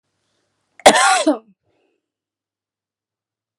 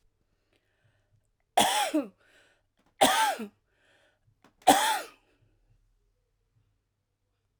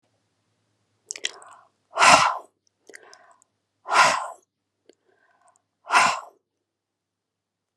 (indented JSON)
{
  "cough_length": "3.6 s",
  "cough_amplitude": 32768,
  "cough_signal_mean_std_ratio": 0.27,
  "three_cough_length": "7.6 s",
  "three_cough_amplitude": 18712,
  "three_cough_signal_mean_std_ratio": 0.3,
  "exhalation_length": "7.8 s",
  "exhalation_amplitude": 32768,
  "exhalation_signal_mean_std_ratio": 0.28,
  "survey_phase": "alpha (2021-03-01 to 2021-08-12)",
  "age": "45-64",
  "gender": "Female",
  "wearing_mask": "No",
  "symptom_none": true,
  "smoker_status": "Never smoked",
  "respiratory_condition_asthma": true,
  "respiratory_condition_other": false,
  "recruitment_source": "REACT",
  "submission_delay": "1 day",
  "covid_test_result": "Negative",
  "covid_test_method": "RT-qPCR"
}